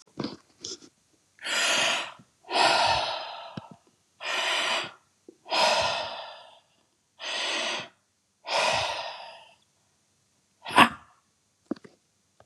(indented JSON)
{
  "exhalation_length": "12.5 s",
  "exhalation_amplitude": 27846,
  "exhalation_signal_mean_std_ratio": 0.47,
  "survey_phase": "beta (2021-08-13 to 2022-03-07)",
  "age": "65+",
  "gender": "Male",
  "wearing_mask": "No",
  "symptom_none": true,
  "smoker_status": "Ex-smoker",
  "respiratory_condition_asthma": false,
  "respiratory_condition_other": false,
  "recruitment_source": "REACT",
  "submission_delay": "2 days",
  "covid_test_result": "Negative",
  "covid_test_method": "RT-qPCR"
}